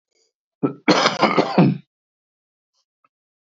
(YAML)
cough_length: 3.5 s
cough_amplitude: 26692
cough_signal_mean_std_ratio: 0.38
survey_phase: beta (2021-08-13 to 2022-03-07)
age: 65+
gender: Male
wearing_mask: 'No'
symptom_cough_any: true
symptom_runny_or_blocked_nose: true
symptom_sore_throat: true
symptom_headache: true
smoker_status: Ex-smoker
respiratory_condition_asthma: false
respiratory_condition_other: false
recruitment_source: REACT
submission_delay: 1 day
covid_test_result: Negative
covid_test_method: RT-qPCR